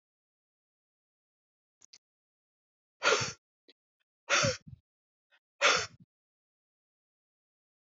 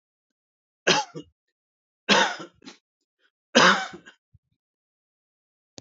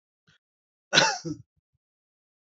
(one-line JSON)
{"exhalation_length": "7.9 s", "exhalation_amplitude": 9612, "exhalation_signal_mean_std_ratio": 0.24, "three_cough_length": "5.8 s", "three_cough_amplitude": 30294, "three_cough_signal_mean_std_ratio": 0.27, "cough_length": "2.5 s", "cough_amplitude": 19234, "cough_signal_mean_std_ratio": 0.25, "survey_phase": "beta (2021-08-13 to 2022-03-07)", "age": "45-64", "gender": "Male", "wearing_mask": "No", "symptom_new_continuous_cough": true, "symptom_runny_or_blocked_nose": true, "symptom_sore_throat": true, "symptom_headache": true, "symptom_onset": "5 days", "smoker_status": "Ex-smoker", "respiratory_condition_asthma": false, "respiratory_condition_other": false, "recruitment_source": "Test and Trace", "submission_delay": "3 days", "covid_test_result": "Positive", "covid_test_method": "RT-qPCR", "covid_ct_value": 19.0, "covid_ct_gene": "ORF1ab gene", "covid_ct_mean": 19.2, "covid_viral_load": "520000 copies/ml", "covid_viral_load_category": "Low viral load (10K-1M copies/ml)"}